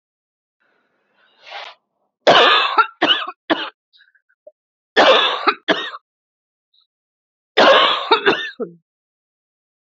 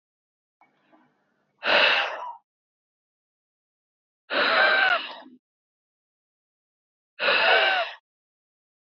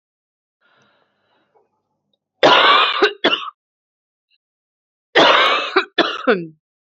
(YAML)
three_cough_length: 9.9 s
three_cough_amplitude: 32767
three_cough_signal_mean_std_ratio: 0.39
exhalation_length: 9.0 s
exhalation_amplitude: 16038
exhalation_signal_mean_std_ratio: 0.39
cough_length: 7.0 s
cough_amplitude: 32707
cough_signal_mean_std_ratio: 0.4
survey_phase: beta (2021-08-13 to 2022-03-07)
age: 18-44
gender: Female
wearing_mask: 'No'
symptom_cough_any: true
symptom_new_continuous_cough: true
symptom_headache: true
symptom_other: true
smoker_status: Never smoked
respiratory_condition_asthma: false
respiratory_condition_other: false
recruitment_source: Test and Trace
submission_delay: 2 days
covid_test_result: Positive
covid_test_method: RT-qPCR
covid_ct_value: 27.8
covid_ct_gene: N gene